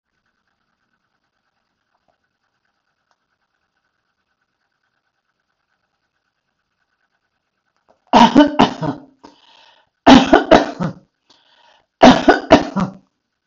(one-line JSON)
{"three_cough_length": "13.5 s", "three_cough_amplitude": 32768, "three_cough_signal_mean_std_ratio": 0.26, "survey_phase": "beta (2021-08-13 to 2022-03-07)", "age": "65+", "gender": "Female", "wearing_mask": "No", "symptom_none": true, "smoker_status": "Never smoked", "respiratory_condition_asthma": false, "respiratory_condition_other": false, "recruitment_source": "REACT", "submission_delay": "2 days", "covid_test_result": "Negative", "covid_test_method": "RT-qPCR", "influenza_a_test_result": "Negative", "influenza_b_test_result": "Negative"}